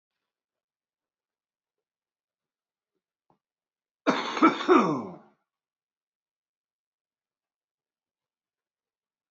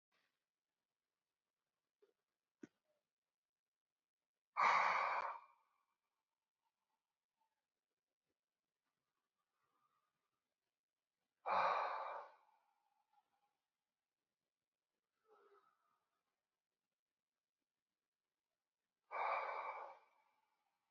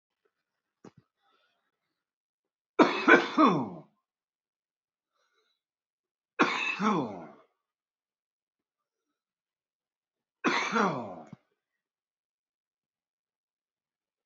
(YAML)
cough_length: 9.3 s
cough_amplitude: 16594
cough_signal_mean_std_ratio: 0.21
exhalation_length: 20.9 s
exhalation_amplitude: 2117
exhalation_signal_mean_std_ratio: 0.25
three_cough_length: 14.3 s
three_cough_amplitude: 20704
three_cough_signal_mean_std_ratio: 0.26
survey_phase: beta (2021-08-13 to 2022-03-07)
age: 45-64
gender: Male
wearing_mask: 'No'
symptom_cough_any: true
symptom_runny_or_blocked_nose: true
symptom_fatigue: true
symptom_change_to_sense_of_smell_or_taste: true
symptom_loss_of_taste: true
smoker_status: Current smoker (1 to 10 cigarettes per day)
respiratory_condition_asthma: false
respiratory_condition_other: false
recruitment_source: Test and Trace
submission_delay: 2 days
covid_test_result: Positive
covid_test_method: RT-qPCR
covid_ct_value: 27.7
covid_ct_gene: ORF1ab gene
covid_ct_mean: 28.5
covid_viral_load: 460 copies/ml
covid_viral_load_category: Minimal viral load (< 10K copies/ml)